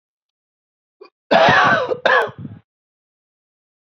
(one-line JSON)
{"cough_length": "3.9 s", "cough_amplitude": 29772, "cough_signal_mean_std_ratio": 0.39, "survey_phase": "beta (2021-08-13 to 2022-03-07)", "age": "18-44", "gender": "Male", "wearing_mask": "No", "symptom_shortness_of_breath": true, "symptom_fatigue": true, "symptom_change_to_sense_of_smell_or_taste": true, "symptom_onset": "6 days", "smoker_status": "Ex-smoker", "respiratory_condition_asthma": false, "respiratory_condition_other": false, "recruitment_source": "Test and Trace", "submission_delay": "2 days", "covid_test_result": "Positive", "covid_test_method": "RT-qPCR", "covid_ct_value": 21.8, "covid_ct_gene": "ORF1ab gene", "covid_ct_mean": 22.0, "covid_viral_load": "60000 copies/ml", "covid_viral_load_category": "Low viral load (10K-1M copies/ml)"}